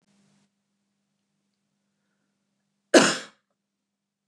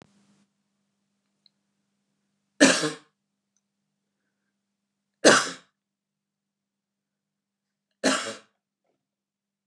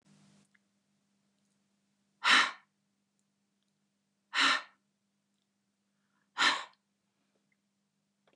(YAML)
cough_length: 4.3 s
cough_amplitude: 27308
cough_signal_mean_std_ratio: 0.16
three_cough_length: 9.7 s
three_cough_amplitude: 28041
three_cough_signal_mean_std_ratio: 0.19
exhalation_length: 8.4 s
exhalation_amplitude: 8064
exhalation_signal_mean_std_ratio: 0.23
survey_phase: beta (2021-08-13 to 2022-03-07)
age: 45-64
gender: Female
wearing_mask: 'No'
symptom_runny_or_blocked_nose: true
symptom_fatigue: true
smoker_status: Ex-smoker
respiratory_condition_asthma: false
respiratory_condition_other: false
recruitment_source: REACT
submission_delay: 3 days
covid_test_result: Negative
covid_test_method: RT-qPCR
influenza_a_test_result: Negative
influenza_b_test_result: Negative